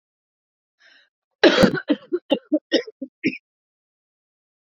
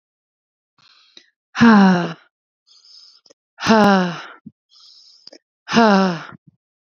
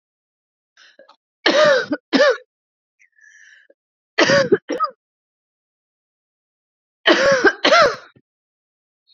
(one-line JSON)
{"cough_length": "4.6 s", "cough_amplitude": 27493, "cough_signal_mean_std_ratio": 0.3, "exhalation_length": "7.0 s", "exhalation_amplitude": 30684, "exhalation_signal_mean_std_ratio": 0.39, "three_cough_length": "9.1 s", "three_cough_amplitude": 30249, "three_cough_signal_mean_std_ratio": 0.38, "survey_phase": "beta (2021-08-13 to 2022-03-07)", "age": "18-44", "gender": "Female", "wearing_mask": "No", "symptom_cough_any": true, "symptom_shortness_of_breath": true, "symptom_sore_throat": true, "symptom_fatigue": true, "symptom_headache": true, "smoker_status": "Ex-smoker", "respiratory_condition_asthma": true, "respiratory_condition_other": false, "recruitment_source": "REACT", "submission_delay": "2 days", "covid_test_result": "Positive", "covid_test_method": "RT-qPCR", "covid_ct_value": 31.0, "covid_ct_gene": "E gene", "influenza_a_test_result": "Negative", "influenza_b_test_result": "Negative"}